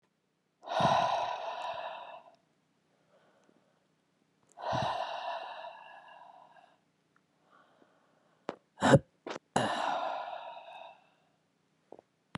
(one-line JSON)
{"exhalation_length": "12.4 s", "exhalation_amplitude": 13216, "exhalation_signal_mean_std_ratio": 0.37, "survey_phase": "beta (2021-08-13 to 2022-03-07)", "age": "45-64", "gender": "Female", "wearing_mask": "No", "symptom_cough_any": true, "symptom_shortness_of_breath": true, "symptom_fatigue": true, "symptom_headache": true, "symptom_change_to_sense_of_smell_or_taste": true, "symptom_onset": "4 days", "smoker_status": "Ex-smoker", "respiratory_condition_asthma": false, "respiratory_condition_other": false, "recruitment_source": "Test and Trace", "submission_delay": "1 day", "covid_test_result": "Positive", "covid_test_method": "ePCR"}